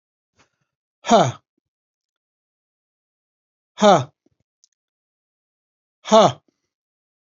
{"exhalation_length": "7.3 s", "exhalation_amplitude": 32767, "exhalation_signal_mean_std_ratio": 0.23, "survey_phase": "alpha (2021-03-01 to 2021-08-12)", "age": "45-64", "gender": "Male", "wearing_mask": "No", "symptom_none": true, "smoker_status": "Ex-smoker", "respiratory_condition_asthma": false, "respiratory_condition_other": false, "recruitment_source": "REACT", "submission_delay": "2 days", "covid_test_result": "Negative", "covid_test_method": "RT-qPCR"}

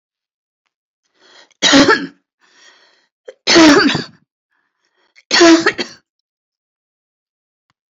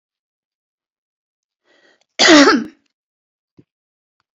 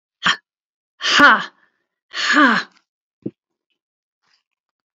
{"three_cough_length": "7.9 s", "three_cough_amplitude": 32768, "three_cough_signal_mean_std_ratio": 0.35, "cough_length": "4.4 s", "cough_amplitude": 30141, "cough_signal_mean_std_ratio": 0.26, "exhalation_length": "4.9 s", "exhalation_amplitude": 29135, "exhalation_signal_mean_std_ratio": 0.34, "survey_phase": "alpha (2021-03-01 to 2021-08-12)", "age": "65+", "gender": "Female", "wearing_mask": "No", "symptom_cough_any": true, "smoker_status": "Ex-smoker", "respiratory_condition_asthma": true, "respiratory_condition_other": false, "recruitment_source": "REACT", "submission_delay": "1 day", "covid_test_result": "Negative", "covid_test_method": "RT-qPCR"}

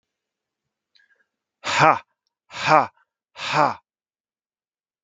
{"exhalation_length": "5.0 s", "exhalation_amplitude": 32768, "exhalation_signal_mean_std_ratio": 0.28, "survey_phase": "beta (2021-08-13 to 2022-03-07)", "age": "18-44", "gender": "Male", "wearing_mask": "No", "symptom_none": true, "smoker_status": "Never smoked", "respiratory_condition_asthma": false, "respiratory_condition_other": false, "recruitment_source": "REACT", "submission_delay": "3 days", "covid_test_result": "Negative", "covid_test_method": "RT-qPCR", "influenza_a_test_result": "Negative", "influenza_b_test_result": "Negative"}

